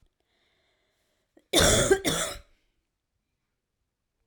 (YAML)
cough_length: 4.3 s
cough_amplitude: 14055
cough_signal_mean_std_ratio: 0.32
survey_phase: alpha (2021-03-01 to 2021-08-12)
age: 18-44
gender: Female
wearing_mask: 'No'
symptom_cough_any: true
symptom_new_continuous_cough: true
symptom_shortness_of_breath: true
symptom_fatigue: true
symptom_fever_high_temperature: true
symptom_headache: true
symptom_onset: 3 days
smoker_status: Ex-smoker
respiratory_condition_asthma: true
respiratory_condition_other: false
recruitment_source: Test and Trace
submission_delay: 2 days
covid_test_result: Positive
covid_test_method: RT-qPCR